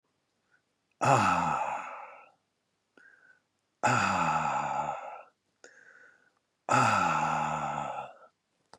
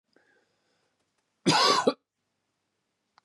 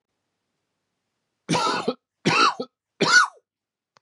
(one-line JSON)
{"exhalation_length": "8.8 s", "exhalation_amplitude": 13104, "exhalation_signal_mean_std_ratio": 0.53, "cough_length": "3.2 s", "cough_amplitude": 10861, "cough_signal_mean_std_ratio": 0.3, "three_cough_length": "4.0 s", "three_cough_amplitude": 20294, "three_cough_signal_mean_std_ratio": 0.39, "survey_phase": "beta (2021-08-13 to 2022-03-07)", "age": "45-64", "gender": "Male", "wearing_mask": "No", "symptom_cough_any": true, "symptom_shortness_of_breath": true, "symptom_fatigue": true, "symptom_headache": true, "symptom_change_to_sense_of_smell_or_taste": true, "symptom_onset": "5 days", "smoker_status": "Ex-smoker", "respiratory_condition_asthma": false, "respiratory_condition_other": false, "recruitment_source": "Test and Trace", "submission_delay": "2 days", "covid_test_result": "Positive", "covid_test_method": "RT-qPCR", "covid_ct_value": 26.1, "covid_ct_gene": "ORF1ab gene"}